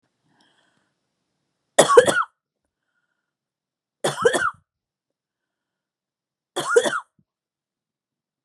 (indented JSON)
{
  "three_cough_length": "8.4 s",
  "three_cough_amplitude": 32768,
  "three_cough_signal_mean_std_ratio": 0.25,
  "survey_phase": "beta (2021-08-13 to 2022-03-07)",
  "age": "65+",
  "gender": "Female",
  "wearing_mask": "No",
  "symptom_none": true,
  "smoker_status": "Never smoked",
  "respiratory_condition_asthma": false,
  "respiratory_condition_other": false,
  "recruitment_source": "REACT",
  "submission_delay": "1 day",
  "covid_test_result": "Negative",
  "covid_test_method": "RT-qPCR"
}